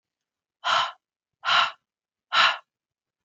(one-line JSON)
{"exhalation_length": "3.2 s", "exhalation_amplitude": 15580, "exhalation_signal_mean_std_ratio": 0.37, "survey_phase": "beta (2021-08-13 to 2022-03-07)", "age": "18-44", "gender": "Female", "wearing_mask": "No", "symptom_none": true, "smoker_status": "Never smoked", "respiratory_condition_asthma": false, "respiratory_condition_other": false, "recruitment_source": "REACT", "submission_delay": "5 days", "covid_test_result": "Negative", "covid_test_method": "RT-qPCR"}